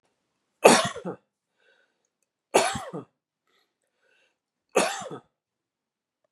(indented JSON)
{
  "three_cough_length": "6.3 s",
  "three_cough_amplitude": 32767,
  "three_cough_signal_mean_std_ratio": 0.24,
  "survey_phase": "beta (2021-08-13 to 2022-03-07)",
  "age": "18-44",
  "gender": "Male",
  "wearing_mask": "No",
  "symptom_runny_or_blocked_nose": true,
  "smoker_status": "Ex-smoker",
  "respiratory_condition_asthma": false,
  "respiratory_condition_other": false,
  "recruitment_source": "REACT",
  "submission_delay": "1 day",
  "covid_test_result": "Negative",
  "covid_test_method": "RT-qPCR",
  "covid_ct_value": 38.8,
  "covid_ct_gene": "N gene",
  "influenza_a_test_result": "Negative",
  "influenza_b_test_result": "Negative"
}